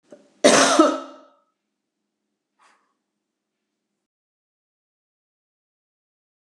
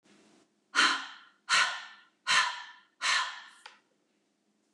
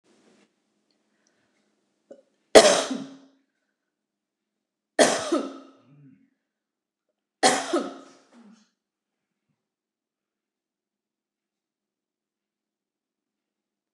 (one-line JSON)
{"cough_length": "6.5 s", "cough_amplitude": 28224, "cough_signal_mean_std_ratio": 0.22, "exhalation_length": "4.7 s", "exhalation_amplitude": 10255, "exhalation_signal_mean_std_ratio": 0.41, "three_cough_length": "13.9 s", "three_cough_amplitude": 29204, "three_cough_signal_mean_std_ratio": 0.19, "survey_phase": "beta (2021-08-13 to 2022-03-07)", "age": "45-64", "gender": "Female", "wearing_mask": "No", "symptom_none": true, "smoker_status": "Never smoked", "respiratory_condition_asthma": false, "respiratory_condition_other": false, "recruitment_source": "REACT", "submission_delay": "1 day", "covid_test_result": "Negative", "covid_test_method": "RT-qPCR"}